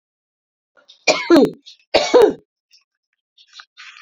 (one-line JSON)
{"three_cough_length": "4.0 s", "three_cough_amplitude": 32768, "three_cough_signal_mean_std_ratio": 0.33, "survey_phase": "beta (2021-08-13 to 2022-03-07)", "age": "45-64", "gender": "Female", "wearing_mask": "No", "symptom_none": true, "smoker_status": "Never smoked", "respiratory_condition_asthma": true, "respiratory_condition_other": false, "recruitment_source": "REACT", "submission_delay": "2 days", "covid_test_result": "Negative", "covid_test_method": "RT-qPCR"}